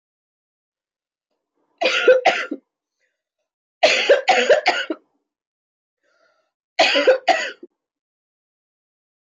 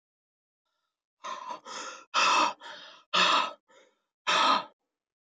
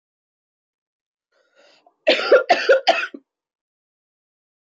{"three_cough_length": "9.2 s", "three_cough_amplitude": 24627, "three_cough_signal_mean_std_ratio": 0.36, "exhalation_length": "5.2 s", "exhalation_amplitude": 10122, "exhalation_signal_mean_std_ratio": 0.44, "cough_length": "4.7 s", "cough_amplitude": 24241, "cough_signal_mean_std_ratio": 0.3, "survey_phase": "beta (2021-08-13 to 2022-03-07)", "age": "18-44", "gender": "Female", "wearing_mask": "No", "symptom_cough_any": true, "symptom_sore_throat": true, "symptom_onset": "8 days", "smoker_status": "Never smoked", "respiratory_condition_asthma": false, "respiratory_condition_other": false, "recruitment_source": "REACT", "submission_delay": "1 day", "covid_test_result": "Negative", "covid_test_method": "RT-qPCR"}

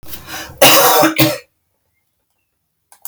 {"cough_length": "3.1 s", "cough_amplitude": 32768, "cough_signal_mean_std_ratio": 0.43, "survey_phase": "alpha (2021-03-01 to 2021-08-12)", "age": "45-64", "gender": "Female", "wearing_mask": "No", "symptom_none": true, "smoker_status": "Current smoker (1 to 10 cigarettes per day)", "respiratory_condition_asthma": false, "respiratory_condition_other": false, "recruitment_source": "REACT", "submission_delay": "1 day", "covid_test_result": "Negative", "covid_test_method": "RT-qPCR"}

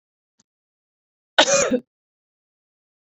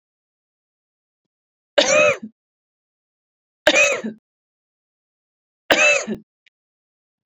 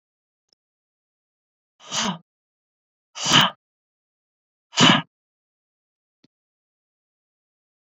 {"cough_length": "3.1 s", "cough_amplitude": 29472, "cough_signal_mean_std_ratio": 0.27, "three_cough_length": "7.3 s", "three_cough_amplitude": 28051, "three_cough_signal_mean_std_ratio": 0.31, "exhalation_length": "7.9 s", "exhalation_amplitude": 28863, "exhalation_signal_mean_std_ratio": 0.22, "survey_phase": "beta (2021-08-13 to 2022-03-07)", "age": "45-64", "gender": "Female", "wearing_mask": "No", "symptom_none": true, "smoker_status": "Never smoked", "respiratory_condition_asthma": false, "respiratory_condition_other": false, "recruitment_source": "REACT", "submission_delay": "1 day", "covid_test_result": "Negative", "covid_test_method": "RT-qPCR"}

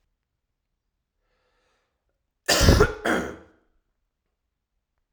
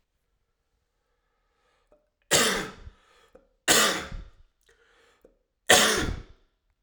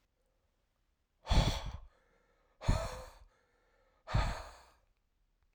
{"cough_length": "5.1 s", "cough_amplitude": 31978, "cough_signal_mean_std_ratio": 0.27, "three_cough_length": "6.8 s", "three_cough_amplitude": 29071, "three_cough_signal_mean_std_ratio": 0.33, "exhalation_length": "5.5 s", "exhalation_amplitude": 4917, "exhalation_signal_mean_std_ratio": 0.33, "survey_phase": "alpha (2021-03-01 to 2021-08-12)", "age": "45-64", "gender": "Male", "wearing_mask": "No", "symptom_cough_any": true, "symptom_fatigue": true, "symptom_headache": true, "symptom_change_to_sense_of_smell_or_taste": true, "symptom_loss_of_taste": true, "symptom_onset": "2 days", "smoker_status": "Ex-smoker", "respiratory_condition_asthma": false, "respiratory_condition_other": false, "recruitment_source": "Test and Trace", "submission_delay": "1 day", "covid_test_result": "Positive", "covid_test_method": "RT-qPCR", "covid_ct_value": 21.5, "covid_ct_gene": "ORF1ab gene"}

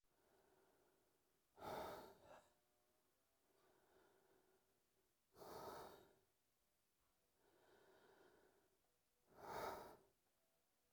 {"exhalation_length": "10.9 s", "exhalation_amplitude": 398, "exhalation_signal_mean_std_ratio": 0.4, "survey_phase": "alpha (2021-03-01 to 2021-08-12)", "age": "18-44", "gender": "Male", "wearing_mask": "No", "symptom_cough_any": true, "symptom_new_continuous_cough": true, "symptom_shortness_of_breath": true, "symptom_diarrhoea": true, "symptom_fatigue": true, "symptom_fever_high_temperature": true, "symptom_headache": true, "symptom_change_to_sense_of_smell_or_taste": true, "symptom_loss_of_taste": true, "symptom_onset": "5 days", "smoker_status": "Never smoked", "respiratory_condition_asthma": false, "respiratory_condition_other": false, "recruitment_source": "Test and Trace", "submission_delay": "2 days", "covid_test_result": "Positive", "covid_test_method": "ePCR"}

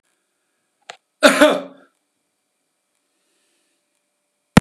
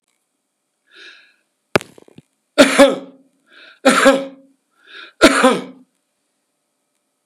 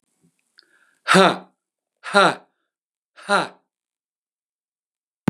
{"cough_length": "4.6 s", "cough_amplitude": 32768, "cough_signal_mean_std_ratio": 0.21, "three_cough_length": "7.3 s", "three_cough_amplitude": 32768, "three_cough_signal_mean_std_ratio": 0.3, "exhalation_length": "5.3 s", "exhalation_amplitude": 30232, "exhalation_signal_mean_std_ratio": 0.26, "survey_phase": "beta (2021-08-13 to 2022-03-07)", "age": "65+", "gender": "Male", "wearing_mask": "No", "symptom_none": true, "smoker_status": "Ex-smoker", "respiratory_condition_asthma": false, "respiratory_condition_other": false, "recruitment_source": "REACT", "submission_delay": "3 days", "covid_test_result": "Negative", "covid_test_method": "RT-qPCR", "influenza_a_test_result": "Unknown/Void", "influenza_b_test_result": "Unknown/Void"}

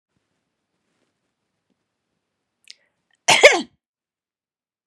{"cough_length": "4.9 s", "cough_amplitude": 32768, "cough_signal_mean_std_ratio": 0.17, "survey_phase": "beta (2021-08-13 to 2022-03-07)", "age": "45-64", "gender": "Female", "wearing_mask": "No", "symptom_none": true, "smoker_status": "Never smoked", "respiratory_condition_asthma": false, "respiratory_condition_other": false, "recruitment_source": "Test and Trace", "submission_delay": "2 days", "covid_test_result": "Negative", "covid_test_method": "RT-qPCR"}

